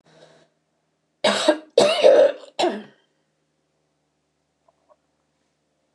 {"cough_length": "5.9 s", "cough_amplitude": 26979, "cough_signal_mean_std_ratio": 0.32, "survey_phase": "beta (2021-08-13 to 2022-03-07)", "age": "65+", "gender": "Female", "wearing_mask": "No", "symptom_none": true, "symptom_onset": "12 days", "smoker_status": "Ex-smoker", "respiratory_condition_asthma": false, "respiratory_condition_other": false, "recruitment_source": "REACT", "submission_delay": "1 day", "covid_test_result": "Negative", "covid_test_method": "RT-qPCR"}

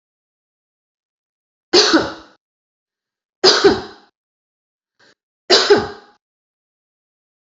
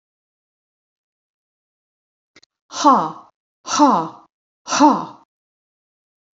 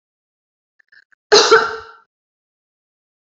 {"three_cough_length": "7.6 s", "three_cough_amplitude": 32767, "three_cough_signal_mean_std_ratio": 0.29, "exhalation_length": "6.4 s", "exhalation_amplitude": 29136, "exhalation_signal_mean_std_ratio": 0.3, "cough_length": "3.2 s", "cough_amplitude": 31143, "cough_signal_mean_std_ratio": 0.27, "survey_phase": "beta (2021-08-13 to 2022-03-07)", "age": "45-64", "gender": "Female", "wearing_mask": "No", "symptom_none": true, "smoker_status": "Never smoked", "respiratory_condition_asthma": false, "respiratory_condition_other": false, "recruitment_source": "REACT", "submission_delay": "2 days", "covid_test_result": "Negative", "covid_test_method": "RT-qPCR"}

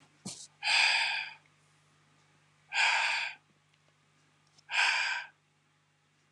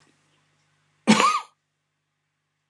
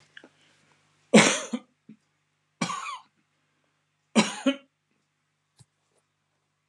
{"exhalation_length": "6.3 s", "exhalation_amplitude": 7096, "exhalation_signal_mean_std_ratio": 0.45, "cough_length": "2.7 s", "cough_amplitude": 28030, "cough_signal_mean_std_ratio": 0.27, "three_cough_length": "6.7 s", "three_cough_amplitude": 24945, "three_cough_signal_mean_std_ratio": 0.24, "survey_phase": "beta (2021-08-13 to 2022-03-07)", "age": "65+", "gender": "Male", "wearing_mask": "No", "symptom_none": true, "smoker_status": "Never smoked", "respiratory_condition_asthma": false, "respiratory_condition_other": false, "recruitment_source": "REACT", "submission_delay": "2 days", "covid_test_result": "Negative", "covid_test_method": "RT-qPCR"}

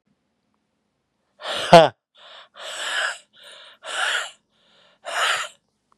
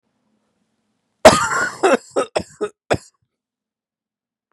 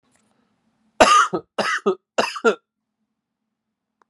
{"exhalation_length": "6.0 s", "exhalation_amplitude": 32768, "exhalation_signal_mean_std_ratio": 0.29, "cough_length": "4.5 s", "cough_amplitude": 32768, "cough_signal_mean_std_ratio": 0.29, "three_cough_length": "4.1 s", "three_cough_amplitude": 32767, "three_cough_signal_mean_std_ratio": 0.34, "survey_phase": "beta (2021-08-13 to 2022-03-07)", "age": "18-44", "gender": "Male", "wearing_mask": "No", "symptom_new_continuous_cough": true, "symptom_runny_or_blocked_nose": true, "symptom_sore_throat": true, "symptom_headache": true, "smoker_status": "Never smoked", "respiratory_condition_asthma": false, "respiratory_condition_other": false, "recruitment_source": "Test and Trace", "submission_delay": "2 days", "covid_test_result": "Positive", "covid_test_method": "RT-qPCR", "covid_ct_value": 18.2, "covid_ct_gene": "ORF1ab gene", "covid_ct_mean": 19.3, "covid_viral_load": "480000 copies/ml", "covid_viral_load_category": "Low viral load (10K-1M copies/ml)"}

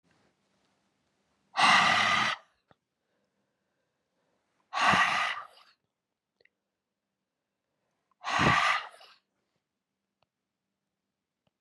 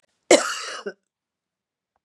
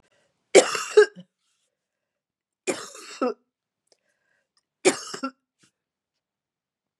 {"exhalation_length": "11.6 s", "exhalation_amplitude": 10554, "exhalation_signal_mean_std_ratio": 0.33, "cough_length": "2.0 s", "cough_amplitude": 30061, "cough_signal_mean_std_ratio": 0.26, "three_cough_length": "7.0 s", "three_cough_amplitude": 32634, "three_cough_signal_mean_std_ratio": 0.22, "survey_phase": "beta (2021-08-13 to 2022-03-07)", "age": "45-64", "gender": "Female", "wearing_mask": "No", "symptom_cough_any": true, "symptom_runny_or_blocked_nose": true, "symptom_onset": "7 days", "smoker_status": "Never smoked", "respiratory_condition_asthma": false, "respiratory_condition_other": false, "recruitment_source": "REACT", "submission_delay": "1 day", "covid_test_result": "Negative", "covid_test_method": "RT-qPCR", "influenza_a_test_result": "Negative", "influenza_b_test_result": "Negative"}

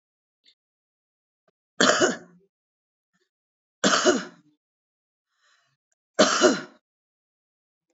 {"three_cough_length": "7.9 s", "three_cough_amplitude": 24781, "three_cough_signal_mean_std_ratio": 0.28, "survey_phase": "alpha (2021-03-01 to 2021-08-12)", "age": "45-64", "gender": "Female", "wearing_mask": "No", "symptom_none": true, "smoker_status": "Current smoker (11 or more cigarettes per day)", "respiratory_condition_asthma": false, "respiratory_condition_other": false, "recruitment_source": "REACT", "submission_delay": "1 day", "covid_test_result": "Negative", "covid_test_method": "RT-qPCR"}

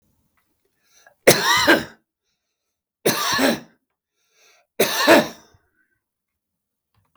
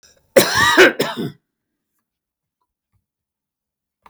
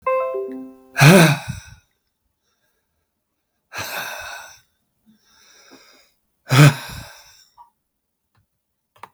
{"three_cough_length": "7.2 s", "three_cough_amplitude": 32768, "three_cough_signal_mean_std_ratio": 0.34, "cough_length": "4.1 s", "cough_amplitude": 32768, "cough_signal_mean_std_ratio": 0.31, "exhalation_length": "9.1 s", "exhalation_amplitude": 32766, "exhalation_signal_mean_std_ratio": 0.29, "survey_phase": "beta (2021-08-13 to 2022-03-07)", "age": "65+", "gender": "Male", "wearing_mask": "No", "symptom_none": true, "smoker_status": "Never smoked", "respiratory_condition_asthma": false, "respiratory_condition_other": false, "recruitment_source": "REACT", "submission_delay": "1 day", "covid_test_result": "Negative", "covid_test_method": "RT-qPCR", "influenza_a_test_result": "Negative", "influenza_b_test_result": "Negative"}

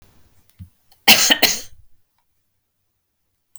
{"cough_length": "3.6 s", "cough_amplitude": 32768, "cough_signal_mean_std_ratio": 0.27, "survey_phase": "beta (2021-08-13 to 2022-03-07)", "age": "45-64", "gender": "Female", "wearing_mask": "No", "symptom_none": true, "smoker_status": "Never smoked", "respiratory_condition_asthma": false, "respiratory_condition_other": false, "recruitment_source": "REACT", "submission_delay": "1 day", "covid_test_result": "Negative", "covid_test_method": "RT-qPCR"}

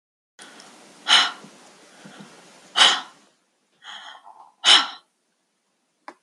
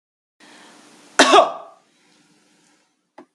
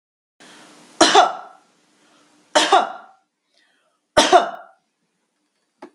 {"exhalation_length": "6.2 s", "exhalation_amplitude": 32636, "exhalation_signal_mean_std_ratio": 0.28, "cough_length": "3.3 s", "cough_amplitude": 32768, "cough_signal_mean_std_ratio": 0.25, "three_cough_length": "5.9 s", "three_cough_amplitude": 32764, "three_cough_signal_mean_std_ratio": 0.31, "survey_phase": "beta (2021-08-13 to 2022-03-07)", "age": "45-64", "gender": "Female", "wearing_mask": "No", "symptom_none": true, "smoker_status": "Never smoked", "respiratory_condition_asthma": false, "respiratory_condition_other": false, "recruitment_source": "REACT", "submission_delay": "3 days", "covid_test_result": "Negative", "covid_test_method": "RT-qPCR"}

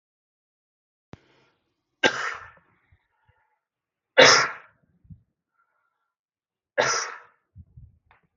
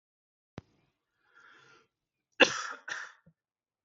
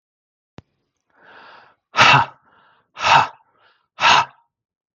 {"three_cough_length": "8.4 s", "three_cough_amplitude": 32234, "three_cough_signal_mean_std_ratio": 0.22, "cough_length": "3.8 s", "cough_amplitude": 15773, "cough_signal_mean_std_ratio": 0.18, "exhalation_length": "4.9 s", "exhalation_amplitude": 32768, "exhalation_signal_mean_std_ratio": 0.32, "survey_phase": "beta (2021-08-13 to 2022-03-07)", "age": "18-44", "gender": "Male", "wearing_mask": "No", "symptom_runny_or_blocked_nose": true, "symptom_sore_throat": true, "symptom_fatigue": true, "symptom_loss_of_taste": true, "symptom_onset": "13 days", "smoker_status": "Ex-smoker", "respiratory_condition_asthma": false, "respiratory_condition_other": false, "recruitment_source": "REACT", "submission_delay": "1 day", "covid_test_result": "Negative", "covid_test_method": "RT-qPCR"}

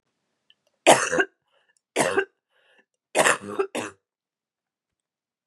{"three_cough_length": "5.5 s", "three_cough_amplitude": 32109, "three_cough_signal_mean_std_ratio": 0.31, "survey_phase": "beta (2021-08-13 to 2022-03-07)", "age": "18-44", "gender": "Female", "wearing_mask": "No", "symptom_cough_any": true, "symptom_fatigue": true, "symptom_onset": "12 days", "smoker_status": "Never smoked", "respiratory_condition_asthma": false, "respiratory_condition_other": false, "recruitment_source": "REACT", "submission_delay": "3 days", "covid_test_result": "Negative", "covid_test_method": "RT-qPCR", "influenza_a_test_result": "Negative", "influenza_b_test_result": "Negative"}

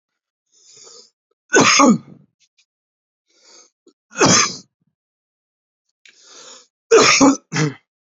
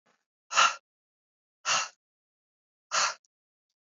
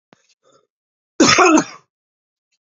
{"three_cough_length": "8.2 s", "three_cough_amplitude": 32056, "three_cough_signal_mean_std_ratio": 0.34, "exhalation_length": "3.9 s", "exhalation_amplitude": 10665, "exhalation_signal_mean_std_ratio": 0.29, "cough_length": "2.6 s", "cough_amplitude": 31104, "cough_signal_mean_std_ratio": 0.34, "survey_phase": "beta (2021-08-13 to 2022-03-07)", "age": "18-44", "gender": "Male", "wearing_mask": "No", "symptom_cough_any": true, "symptom_new_continuous_cough": true, "symptom_runny_or_blocked_nose": true, "symptom_sore_throat": true, "symptom_diarrhoea": true, "symptom_fatigue": true, "symptom_onset": "5 days", "smoker_status": "Never smoked", "respiratory_condition_asthma": false, "respiratory_condition_other": false, "recruitment_source": "Test and Trace", "submission_delay": "2 days", "covid_test_result": "Positive", "covid_test_method": "RT-qPCR", "covid_ct_value": 24.7, "covid_ct_gene": "N gene"}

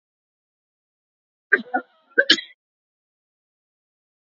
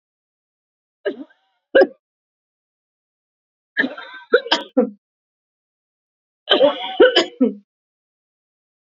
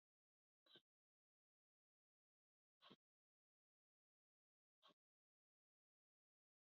{"cough_length": "4.4 s", "cough_amplitude": 32767, "cough_signal_mean_std_ratio": 0.18, "three_cough_length": "9.0 s", "three_cough_amplitude": 28576, "three_cough_signal_mean_std_ratio": 0.29, "exhalation_length": "6.7 s", "exhalation_amplitude": 77, "exhalation_signal_mean_std_ratio": 0.16, "survey_phase": "beta (2021-08-13 to 2022-03-07)", "age": "45-64", "gender": "Female", "wearing_mask": "No", "symptom_none": true, "smoker_status": "Never smoked", "respiratory_condition_asthma": false, "respiratory_condition_other": false, "recruitment_source": "REACT", "submission_delay": "1 day", "covid_test_result": "Negative", "covid_test_method": "RT-qPCR", "influenza_a_test_result": "Negative", "influenza_b_test_result": "Negative"}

